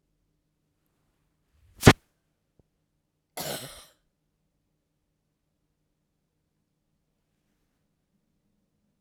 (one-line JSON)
{"cough_length": "9.0 s", "cough_amplitude": 32768, "cough_signal_mean_std_ratio": 0.09, "survey_phase": "alpha (2021-03-01 to 2021-08-12)", "age": "45-64", "gender": "Female", "wearing_mask": "No", "symptom_none": true, "smoker_status": "Never smoked", "respiratory_condition_asthma": false, "respiratory_condition_other": false, "recruitment_source": "REACT", "submission_delay": "2 days", "covid_test_result": "Negative", "covid_test_method": "RT-qPCR"}